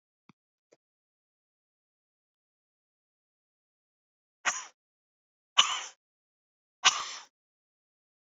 {"exhalation_length": "8.3 s", "exhalation_amplitude": 21481, "exhalation_signal_mean_std_ratio": 0.17, "survey_phase": "beta (2021-08-13 to 2022-03-07)", "age": "45-64", "gender": "Female", "wearing_mask": "No", "symptom_cough_any": true, "symptom_runny_or_blocked_nose": true, "symptom_shortness_of_breath": true, "symptom_sore_throat": true, "symptom_headache": true, "smoker_status": "Ex-smoker", "respiratory_condition_asthma": false, "respiratory_condition_other": true, "recruitment_source": "Test and Trace", "submission_delay": "2 days", "covid_test_result": "Positive", "covid_test_method": "RT-qPCR", "covid_ct_value": 27.1, "covid_ct_gene": "ORF1ab gene", "covid_ct_mean": 27.9, "covid_viral_load": "720 copies/ml", "covid_viral_load_category": "Minimal viral load (< 10K copies/ml)"}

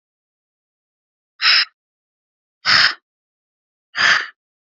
{"exhalation_length": "4.7 s", "exhalation_amplitude": 32767, "exhalation_signal_mean_std_ratio": 0.32, "survey_phase": "beta (2021-08-13 to 2022-03-07)", "age": "18-44", "gender": "Female", "wearing_mask": "No", "symptom_runny_or_blocked_nose": true, "smoker_status": "Ex-smoker", "respiratory_condition_asthma": false, "respiratory_condition_other": false, "recruitment_source": "Test and Trace", "submission_delay": "1 day", "covid_test_result": "Positive", "covid_test_method": "RT-qPCR", "covid_ct_value": 31.0, "covid_ct_gene": "ORF1ab gene", "covid_ct_mean": 31.8, "covid_viral_load": "36 copies/ml", "covid_viral_load_category": "Minimal viral load (< 10K copies/ml)"}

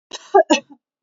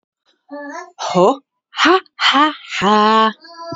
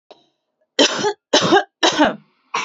{"cough_length": "1.0 s", "cough_amplitude": 27536, "cough_signal_mean_std_ratio": 0.33, "exhalation_length": "3.8 s", "exhalation_amplitude": 32438, "exhalation_signal_mean_std_ratio": 0.55, "three_cough_length": "2.6 s", "three_cough_amplitude": 32768, "three_cough_signal_mean_std_ratio": 0.48, "survey_phase": "beta (2021-08-13 to 2022-03-07)", "age": "18-44", "gender": "Female", "wearing_mask": "Yes", "symptom_none": true, "smoker_status": "Current smoker (e-cigarettes or vapes only)", "respiratory_condition_asthma": false, "respiratory_condition_other": false, "recruitment_source": "REACT", "submission_delay": "1 day", "covid_test_result": "Negative", "covid_test_method": "RT-qPCR", "influenza_a_test_result": "Negative", "influenza_b_test_result": "Negative"}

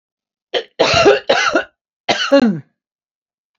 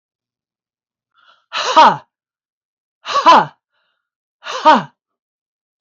{"cough_length": "3.6 s", "cough_amplitude": 28559, "cough_signal_mean_std_ratio": 0.48, "exhalation_length": "5.8 s", "exhalation_amplitude": 29953, "exhalation_signal_mean_std_ratio": 0.31, "survey_phase": "beta (2021-08-13 to 2022-03-07)", "age": "65+", "gender": "Female", "wearing_mask": "No", "symptom_none": true, "smoker_status": "Ex-smoker", "respiratory_condition_asthma": false, "respiratory_condition_other": false, "recruitment_source": "REACT", "submission_delay": "1 day", "covid_test_result": "Negative", "covid_test_method": "RT-qPCR", "influenza_a_test_result": "Negative", "influenza_b_test_result": "Negative"}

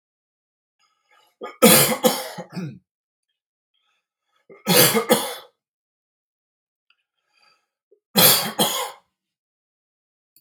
{"three_cough_length": "10.4 s", "three_cough_amplitude": 32768, "three_cough_signal_mean_std_ratio": 0.31, "survey_phase": "beta (2021-08-13 to 2022-03-07)", "age": "45-64", "gender": "Male", "wearing_mask": "No", "symptom_none": true, "smoker_status": "Never smoked", "respiratory_condition_asthma": false, "respiratory_condition_other": false, "recruitment_source": "REACT", "submission_delay": "3 days", "covid_test_result": "Negative", "covid_test_method": "RT-qPCR", "influenza_a_test_result": "Negative", "influenza_b_test_result": "Negative"}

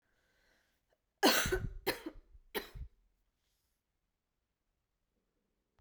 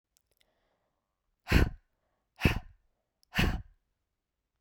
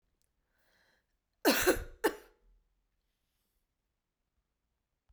{"three_cough_length": "5.8 s", "three_cough_amplitude": 6477, "three_cough_signal_mean_std_ratio": 0.27, "exhalation_length": "4.6 s", "exhalation_amplitude": 11403, "exhalation_signal_mean_std_ratio": 0.27, "cough_length": "5.1 s", "cough_amplitude": 6886, "cough_signal_mean_std_ratio": 0.23, "survey_phase": "beta (2021-08-13 to 2022-03-07)", "age": "45-64", "gender": "Female", "wearing_mask": "No", "symptom_cough_any": true, "symptom_runny_or_blocked_nose": true, "symptom_headache": true, "smoker_status": "Never smoked", "respiratory_condition_asthma": false, "respiratory_condition_other": false, "recruitment_source": "Test and Trace", "submission_delay": "3 days", "covid_test_result": "Positive", "covid_test_method": "RT-qPCR"}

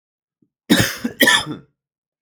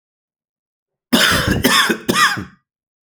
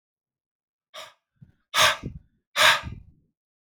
{"cough_length": "2.2 s", "cough_amplitude": 32767, "cough_signal_mean_std_ratio": 0.39, "three_cough_length": "3.1 s", "three_cough_amplitude": 32767, "three_cough_signal_mean_std_ratio": 0.51, "exhalation_length": "3.8 s", "exhalation_amplitude": 19699, "exhalation_signal_mean_std_ratio": 0.3, "survey_phase": "alpha (2021-03-01 to 2021-08-12)", "age": "18-44", "gender": "Male", "wearing_mask": "No", "symptom_cough_any": true, "symptom_new_continuous_cough": true, "symptom_fatigue": true, "symptom_fever_high_temperature": true, "symptom_onset": "3 days", "smoker_status": "Current smoker (e-cigarettes or vapes only)", "respiratory_condition_asthma": false, "respiratory_condition_other": false, "recruitment_source": "Test and Trace", "submission_delay": "1 day", "covid_test_result": "Positive", "covid_test_method": "RT-qPCR", "covid_ct_value": 27.2, "covid_ct_gene": "ORF1ab gene", "covid_ct_mean": 28.0, "covid_viral_load": "680 copies/ml", "covid_viral_load_category": "Minimal viral load (< 10K copies/ml)"}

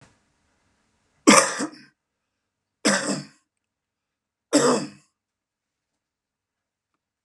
{"three_cough_length": "7.2 s", "three_cough_amplitude": 32662, "three_cough_signal_mean_std_ratio": 0.26, "survey_phase": "beta (2021-08-13 to 2022-03-07)", "age": "65+", "gender": "Male", "wearing_mask": "No", "symptom_none": true, "smoker_status": "Ex-smoker", "respiratory_condition_asthma": false, "respiratory_condition_other": false, "recruitment_source": "REACT", "submission_delay": "2 days", "covid_test_result": "Negative", "covid_test_method": "RT-qPCR", "influenza_a_test_result": "Negative", "influenza_b_test_result": "Negative"}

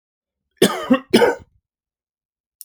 {"cough_length": "2.6 s", "cough_amplitude": 31228, "cough_signal_mean_std_ratio": 0.33, "survey_phase": "alpha (2021-03-01 to 2021-08-12)", "age": "45-64", "gender": "Male", "wearing_mask": "No", "symptom_none": true, "smoker_status": "Ex-smoker", "respiratory_condition_asthma": false, "respiratory_condition_other": false, "recruitment_source": "REACT", "submission_delay": "1 day", "covid_test_result": "Negative", "covid_test_method": "RT-qPCR"}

